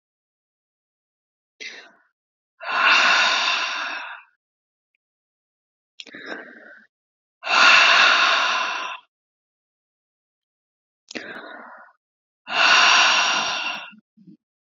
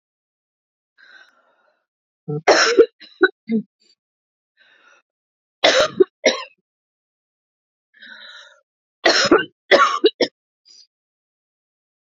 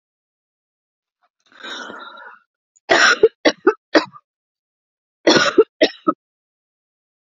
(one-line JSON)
{"exhalation_length": "14.7 s", "exhalation_amplitude": 27375, "exhalation_signal_mean_std_ratio": 0.43, "three_cough_length": "12.1 s", "three_cough_amplitude": 29703, "three_cough_signal_mean_std_ratio": 0.3, "cough_length": "7.3 s", "cough_amplitude": 32768, "cough_signal_mean_std_ratio": 0.3, "survey_phase": "beta (2021-08-13 to 2022-03-07)", "age": "45-64", "gender": "Female", "wearing_mask": "No", "symptom_cough_any": true, "symptom_runny_or_blocked_nose": true, "symptom_sore_throat": true, "symptom_fatigue": true, "symptom_headache": true, "symptom_change_to_sense_of_smell_or_taste": true, "symptom_onset": "4 days", "smoker_status": "Never smoked", "respiratory_condition_asthma": true, "respiratory_condition_other": false, "recruitment_source": "Test and Trace", "submission_delay": "1 day", "covid_test_result": "Positive", "covid_test_method": "RT-qPCR", "covid_ct_value": 25.4, "covid_ct_gene": "ORF1ab gene", "covid_ct_mean": 25.7, "covid_viral_load": "3700 copies/ml", "covid_viral_load_category": "Minimal viral load (< 10K copies/ml)"}